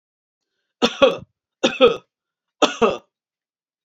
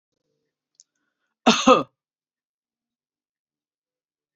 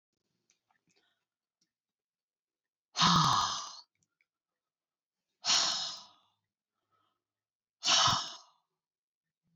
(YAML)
three_cough_length: 3.8 s
three_cough_amplitude: 29435
three_cough_signal_mean_std_ratio: 0.32
cough_length: 4.4 s
cough_amplitude: 28196
cough_signal_mean_std_ratio: 0.19
exhalation_length: 9.6 s
exhalation_amplitude: 8519
exhalation_signal_mean_std_ratio: 0.32
survey_phase: beta (2021-08-13 to 2022-03-07)
age: 65+
gender: Female
wearing_mask: 'No'
symptom_none: true
smoker_status: Never smoked
respiratory_condition_asthma: false
respiratory_condition_other: false
recruitment_source: REACT
submission_delay: 2 days
covid_test_result: Negative
covid_test_method: RT-qPCR